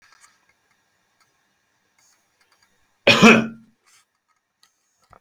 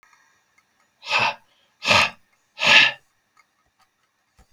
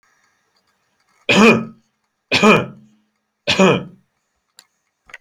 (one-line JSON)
{"cough_length": "5.2 s", "cough_amplitude": 29629, "cough_signal_mean_std_ratio": 0.21, "exhalation_length": "4.5 s", "exhalation_amplitude": 28191, "exhalation_signal_mean_std_ratio": 0.32, "three_cough_length": "5.2 s", "three_cough_amplitude": 32224, "three_cough_signal_mean_std_ratio": 0.35, "survey_phase": "alpha (2021-03-01 to 2021-08-12)", "age": "65+", "gender": "Male", "wearing_mask": "No", "symptom_none": true, "smoker_status": "Never smoked", "respiratory_condition_asthma": false, "respiratory_condition_other": false, "recruitment_source": "REACT", "submission_delay": "2 days", "covid_test_result": "Negative", "covid_test_method": "RT-qPCR"}